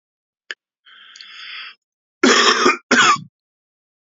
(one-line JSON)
{"cough_length": "4.1 s", "cough_amplitude": 31323, "cough_signal_mean_std_ratio": 0.39, "survey_phase": "beta (2021-08-13 to 2022-03-07)", "age": "45-64", "gender": "Male", "wearing_mask": "No", "symptom_none": true, "symptom_onset": "5 days", "smoker_status": "Never smoked", "respiratory_condition_asthma": false, "respiratory_condition_other": false, "recruitment_source": "Test and Trace", "submission_delay": "1 day", "covid_test_result": "Positive", "covid_test_method": "RT-qPCR", "covid_ct_value": 17.4, "covid_ct_gene": "ORF1ab gene", "covid_ct_mean": 17.6, "covid_viral_load": "1700000 copies/ml", "covid_viral_load_category": "High viral load (>1M copies/ml)"}